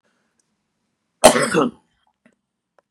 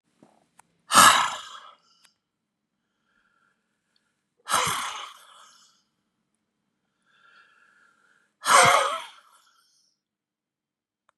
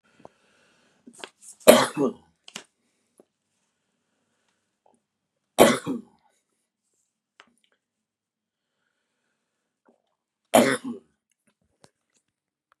{
  "cough_length": "2.9 s",
  "cough_amplitude": 32768,
  "cough_signal_mean_std_ratio": 0.26,
  "exhalation_length": "11.2 s",
  "exhalation_amplitude": 29844,
  "exhalation_signal_mean_std_ratio": 0.26,
  "three_cough_length": "12.8 s",
  "three_cough_amplitude": 32768,
  "three_cough_signal_mean_std_ratio": 0.18,
  "survey_phase": "beta (2021-08-13 to 2022-03-07)",
  "age": "65+",
  "gender": "Male",
  "wearing_mask": "No",
  "symptom_none": true,
  "smoker_status": "Never smoked",
  "respiratory_condition_asthma": false,
  "respiratory_condition_other": false,
  "recruitment_source": "REACT",
  "submission_delay": "1 day",
  "covid_test_result": "Negative",
  "covid_test_method": "RT-qPCR",
  "influenza_a_test_result": "Negative",
  "influenza_b_test_result": "Negative"
}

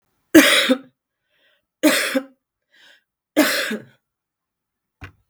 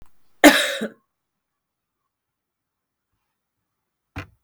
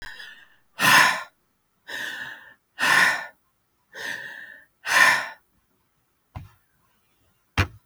{
  "three_cough_length": "5.3 s",
  "three_cough_amplitude": 32768,
  "three_cough_signal_mean_std_ratio": 0.34,
  "cough_length": "4.4 s",
  "cough_amplitude": 32768,
  "cough_signal_mean_std_ratio": 0.19,
  "exhalation_length": "7.9 s",
  "exhalation_amplitude": 25179,
  "exhalation_signal_mean_std_ratio": 0.37,
  "survey_phase": "beta (2021-08-13 to 2022-03-07)",
  "age": "45-64",
  "gender": "Female",
  "wearing_mask": "Yes",
  "symptom_cough_any": true,
  "symptom_runny_or_blocked_nose": true,
  "symptom_fatigue": true,
  "smoker_status": "Ex-smoker",
  "respiratory_condition_asthma": false,
  "respiratory_condition_other": false,
  "recruitment_source": "REACT",
  "submission_delay": "4 days",
  "covid_test_result": "Positive",
  "covid_test_method": "RT-qPCR",
  "covid_ct_value": 37.0,
  "covid_ct_gene": "N gene",
  "influenza_a_test_result": "Negative",
  "influenza_b_test_result": "Negative"
}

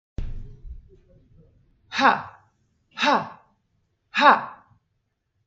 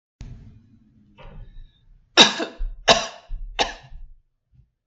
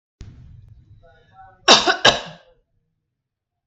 {
  "exhalation_length": "5.5 s",
  "exhalation_amplitude": 29551,
  "exhalation_signal_mean_std_ratio": 0.32,
  "three_cough_length": "4.9 s",
  "three_cough_amplitude": 32768,
  "three_cough_signal_mean_std_ratio": 0.3,
  "cough_length": "3.7 s",
  "cough_amplitude": 32768,
  "cough_signal_mean_std_ratio": 0.26,
  "survey_phase": "beta (2021-08-13 to 2022-03-07)",
  "age": "45-64",
  "gender": "Female",
  "wearing_mask": "No",
  "symptom_none": true,
  "smoker_status": "Never smoked",
  "respiratory_condition_asthma": false,
  "respiratory_condition_other": false,
  "recruitment_source": "REACT",
  "submission_delay": "2 days",
  "covid_test_result": "Negative",
  "covid_test_method": "RT-qPCR",
  "influenza_a_test_result": "Negative",
  "influenza_b_test_result": "Negative"
}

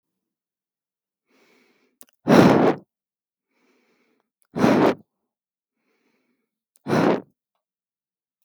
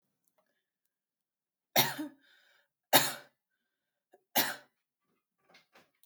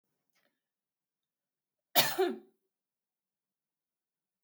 {
  "exhalation_length": "8.4 s",
  "exhalation_amplitude": 32768,
  "exhalation_signal_mean_std_ratio": 0.29,
  "three_cough_length": "6.1 s",
  "three_cough_amplitude": 15897,
  "three_cough_signal_mean_std_ratio": 0.22,
  "cough_length": "4.4 s",
  "cough_amplitude": 11739,
  "cough_signal_mean_std_ratio": 0.21,
  "survey_phase": "beta (2021-08-13 to 2022-03-07)",
  "age": "18-44",
  "gender": "Female",
  "wearing_mask": "No",
  "symptom_none": true,
  "smoker_status": "Never smoked",
  "respiratory_condition_asthma": false,
  "respiratory_condition_other": false,
  "recruitment_source": "REACT",
  "submission_delay": "5 days",
  "covid_test_result": "Negative",
  "covid_test_method": "RT-qPCR",
  "influenza_a_test_result": "Negative",
  "influenza_b_test_result": "Negative"
}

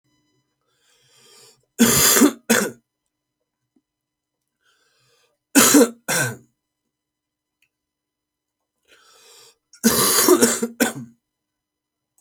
{
  "three_cough_length": "12.2 s",
  "three_cough_amplitude": 32767,
  "three_cough_signal_mean_std_ratio": 0.33,
  "survey_phase": "alpha (2021-03-01 to 2021-08-12)",
  "age": "18-44",
  "gender": "Male",
  "wearing_mask": "No",
  "symptom_new_continuous_cough": true,
  "symptom_shortness_of_breath": true,
  "symptom_fever_high_temperature": true,
  "symptom_headache": true,
  "symptom_onset": "3 days",
  "smoker_status": "Never smoked",
  "respiratory_condition_asthma": true,
  "respiratory_condition_other": false,
  "recruitment_source": "Test and Trace",
  "submission_delay": "2 days",
  "covid_test_result": "Positive",
  "covid_test_method": "RT-qPCR",
  "covid_ct_value": 18.2,
  "covid_ct_gene": "ORF1ab gene"
}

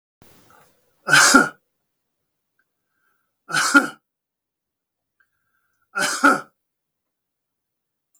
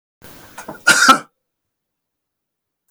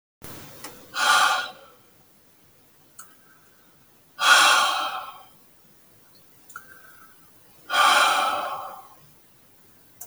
{
  "three_cough_length": "8.2 s",
  "three_cough_amplitude": 32766,
  "three_cough_signal_mean_std_ratio": 0.27,
  "cough_length": "2.9 s",
  "cough_amplitude": 32768,
  "cough_signal_mean_std_ratio": 0.28,
  "exhalation_length": "10.1 s",
  "exhalation_amplitude": 25260,
  "exhalation_signal_mean_std_ratio": 0.41,
  "survey_phase": "beta (2021-08-13 to 2022-03-07)",
  "age": "45-64",
  "gender": "Male",
  "wearing_mask": "No",
  "symptom_none": true,
  "smoker_status": "Never smoked",
  "respiratory_condition_asthma": false,
  "respiratory_condition_other": false,
  "recruitment_source": "REACT",
  "submission_delay": "1 day",
  "covid_test_result": "Negative",
  "covid_test_method": "RT-qPCR",
  "influenza_a_test_result": "Negative",
  "influenza_b_test_result": "Negative"
}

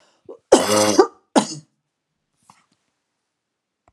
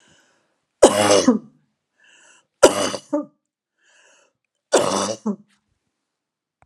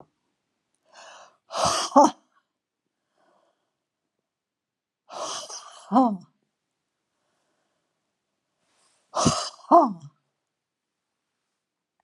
{
  "cough_length": "3.9 s",
  "cough_amplitude": 32768,
  "cough_signal_mean_std_ratio": 0.3,
  "three_cough_length": "6.7 s",
  "three_cough_amplitude": 32768,
  "three_cough_signal_mean_std_ratio": 0.32,
  "exhalation_length": "12.0 s",
  "exhalation_amplitude": 23955,
  "exhalation_signal_mean_std_ratio": 0.25,
  "survey_phase": "beta (2021-08-13 to 2022-03-07)",
  "age": "65+",
  "gender": "Female",
  "wearing_mask": "No",
  "symptom_none": true,
  "smoker_status": "Ex-smoker",
  "respiratory_condition_asthma": false,
  "respiratory_condition_other": false,
  "recruitment_source": "REACT",
  "submission_delay": "1 day",
  "covid_test_result": "Negative",
  "covid_test_method": "RT-qPCR"
}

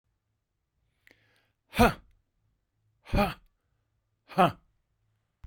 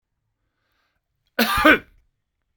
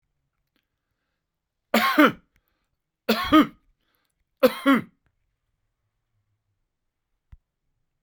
{
  "exhalation_length": "5.5 s",
  "exhalation_amplitude": 14559,
  "exhalation_signal_mean_std_ratio": 0.23,
  "cough_length": "2.6 s",
  "cough_amplitude": 30430,
  "cough_signal_mean_std_ratio": 0.28,
  "three_cough_length": "8.0 s",
  "three_cough_amplitude": 21858,
  "three_cough_signal_mean_std_ratio": 0.25,
  "survey_phase": "beta (2021-08-13 to 2022-03-07)",
  "age": "45-64",
  "gender": "Male",
  "wearing_mask": "No",
  "symptom_runny_or_blocked_nose": true,
  "symptom_sore_throat": true,
  "smoker_status": "Never smoked",
  "respiratory_condition_asthma": false,
  "respiratory_condition_other": false,
  "recruitment_source": "REACT",
  "submission_delay": "1 day",
  "covid_test_result": "Negative",
  "covid_test_method": "RT-qPCR"
}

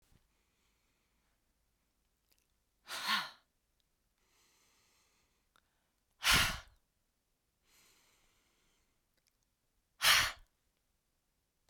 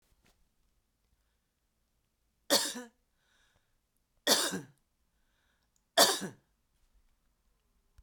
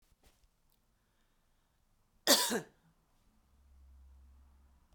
{
  "exhalation_length": "11.7 s",
  "exhalation_amplitude": 7263,
  "exhalation_signal_mean_std_ratio": 0.22,
  "three_cough_length": "8.0 s",
  "three_cough_amplitude": 14214,
  "three_cough_signal_mean_std_ratio": 0.23,
  "cough_length": "4.9 s",
  "cough_amplitude": 8461,
  "cough_signal_mean_std_ratio": 0.21,
  "survey_phase": "beta (2021-08-13 to 2022-03-07)",
  "age": "45-64",
  "gender": "Female",
  "wearing_mask": "No",
  "symptom_none": true,
  "smoker_status": "Ex-smoker",
  "respiratory_condition_asthma": false,
  "respiratory_condition_other": false,
  "recruitment_source": "REACT",
  "submission_delay": "2 days",
  "covid_test_result": "Negative",
  "covid_test_method": "RT-qPCR"
}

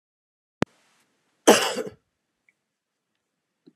{
  "cough_length": "3.8 s",
  "cough_amplitude": 30231,
  "cough_signal_mean_std_ratio": 0.19,
  "survey_phase": "alpha (2021-03-01 to 2021-08-12)",
  "age": "45-64",
  "gender": "Female",
  "wearing_mask": "No",
  "symptom_fatigue": true,
  "smoker_status": "Never smoked",
  "respiratory_condition_asthma": false,
  "respiratory_condition_other": false,
  "recruitment_source": "REACT",
  "submission_delay": "1 day",
  "covid_test_result": "Negative",
  "covid_test_method": "RT-qPCR"
}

